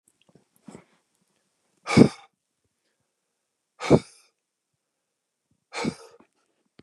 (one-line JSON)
{"exhalation_length": "6.8 s", "exhalation_amplitude": 29203, "exhalation_signal_mean_std_ratio": 0.17, "survey_phase": "beta (2021-08-13 to 2022-03-07)", "age": "45-64", "gender": "Male", "wearing_mask": "No", "symptom_none": true, "symptom_onset": "12 days", "smoker_status": "Never smoked", "respiratory_condition_asthma": false, "respiratory_condition_other": false, "recruitment_source": "REACT", "submission_delay": "2 days", "covid_test_result": "Negative", "covid_test_method": "RT-qPCR", "influenza_a_test_result": "Negative", "influenza_b_test_result": "Negative"}